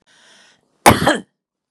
cough_length: 1.7 s
cough_amplitude: 32768
cough_signal_mean_std_ratio: 0.3
survey_phase: beta (2021-08-13 to 2022-03-07)
age: 18-44
gender: Female
wearing_mask: 'No'
symptom_none: true
symptom_onset: 4 days
smoker_status: Ex-smoker
respiratory_condition_asthma: false
respiratory_condition_other: false
recruitment_source: REACT
submission_delay: 1 day
covid_test_result: Negative
covid_test_method: RT-qPCR
influenza_a_test_result: Negative
influenza_b_test_result: Negative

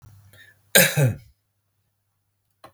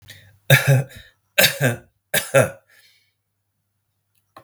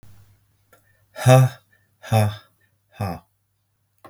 cough_length: 2.7 s
cough_amplitude: 32768
cough_signal_mean_std_ratio: 0.29
three_cough_length: 4.4 s
three_cough_amplitude: 32768
three_cough_signal_mean_std_ratio: 0.35
exhalation_length: 4.1 s
exhalation_amplitude: 31752
exhalation_signal_mean_std_ratio: 0.31
survey_phase: beta (2021-08-13 to 2022-03-07)
age: 65+
gender: Male
wearing_mask: 'No'
symptom_none: true
smoker_status: Never smoked
respiratory_condition_asthma: false
respiratory_condition_other: false
recruitment_source: REACT
submission_delay: 1 day
covid_test_result: Negative
covid_test_method: RT-qPCR
influenza_a_test_result: Unknown/Void
influenza_b_test_result: Unknown/Void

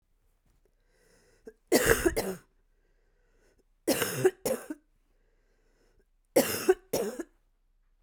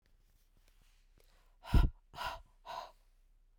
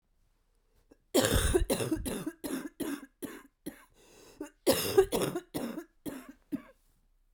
three_cough_length: 8.0 s
three_cough_amplitude: 14431
three_cough_signal_mean_std_ratio: 0.34
exhalation_length: 3.6 s
exhalation_amplitude: 5716
exhalation_signal_mean_std_ratio: 0.25
cough_length: 7.3 s
cough_amplitude: 10232
cough_signal_mean_std_ratio: 0.45
survey_phase: beta (2021-08-13 to 2022-03-07)
age: 45-64
gender: Female
wearing_mask: 'No'
symptom_cough_any: true
symptom_runny_or_blocked_nose: true
symptom_sore_throat: true
symptom_fatigue: true
symptom_headache: true
symptom_change_to_sense_of_smell_or_taste: true
symptom_loss_of_taste: true
symptom_other: true
symptom_onset: 3 days
smoker_status: Never smoked
respiratory_condition_asthma: false
respiratory_condition_other: false
recruitment_source: Test and Trace
submission_delay: 2 days
covid_test_result: Positive
covid_test_method: RT-qPCR
covid_ct_value: 21.0
covid_ct_gene: ORF1ab gene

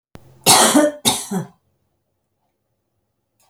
cough_length: 3.5 s
cough_amplitude: 32768
cough_signal_mean_std_ratio: 0.36
survey_phase: alpha (2021-03-01 to 2021-08-12)
age: 65+
gender: Female
wearing_mask: 'No'
symptom_none: true
smoker_status: Ex-smoker
respiratory_condition_asthma: false
respiratory_condition_other: false
recruitment_source: REACT
submission_delay: 1 day
covid_test_result: Negative
covid_test_method: RT-qPCR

